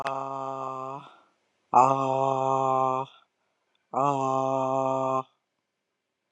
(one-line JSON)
{"exhalation_length": "6.3 s", "exhalation_amplitude": 17835, "exhalation_signal_mean_std_ratio": 0.53, "survey_phase": "alpha (2021-03-01 to 2021-08-12)", "age": "45-64", "gender": "Female", "wearing_mask": "No", "symptom_diarrhoea": true, "symptom_headache": true, "symptom_change_to_sense_of_smell_or_taste": true, "smoker_status": "Ex-smoker", "respiratory_condition_asthma": false, "respiratory_condition_other": false, "recruitment_source": "REACT", "submission_delay": "7 days", "covid_test_result": "Negative", "covid_test_method": "RT-qPCR"}